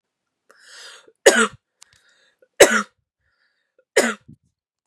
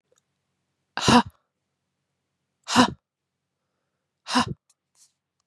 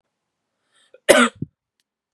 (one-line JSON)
{"three_cough_length": "4.9 s", "three_cough_amplitude": 32768, "three_cough_signal_mean_std_ratio": 0.24, "exhalation_length": "5.5 s", "exhalation_amplitude": 26784, "exhalation_signal_mean_std_ratio": 0.24, "cough_length": "2.1 s", "cough_amplitude": 32768, "cough_signal_mean_std_ratio": 0.24, "survey_phase": "beta (2021-08-13 to 2022-03-07)", "age": "18-44", "gender": "Female", "wearing_mask": "No", "symptom_none": true, "symptom_onset": "4 days", "smoker_status": "Ex-smoker", "respiratory_condition_asthma": false, "respiratory_condition_other": false, "recruitment_source": "REACT", "submission_delay": "0 days", "covid_test_result": "Negative", "covid_test_method": "RT-qPCR", "influenza_a_test_result": "Negative", "influenza_b_test_result": "Negative"}